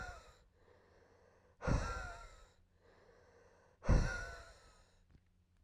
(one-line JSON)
{"exhalation_length": "5.6 s", "exhalation_amplitude": 3759, "exhalation_signal_mean_std_ratio": 0.33, "survey_phase": "alpha (2021-03-01 to 2021-08-12)", "age": "18-44", "gender": "Male", "wearing_mask": "No", "symptom_fatigue": true, "symptom_change_to_sense_of_smell_or_taste": true, "symptom_onset": "6 days", "smoker_status": "Current smoker (e-cigarettes or vapes only)", "respiratory_condition_asthma": false, "respiratory_condition_other": false, "recruitment_source": "Test and Trace", "submission_delay": "1 day", "covid_test_result": "Positive", "covid_test_method": "RT-qPCR", "covid_ct_value": 17.4, "covid_ct_gene": "ORF1ab gene", "covid_ct_mean": 18.4, "covid_viral_load": "940000 copies/ml", "covid_viral_load_category": "Low viral load (10K-1M copies/ml)"}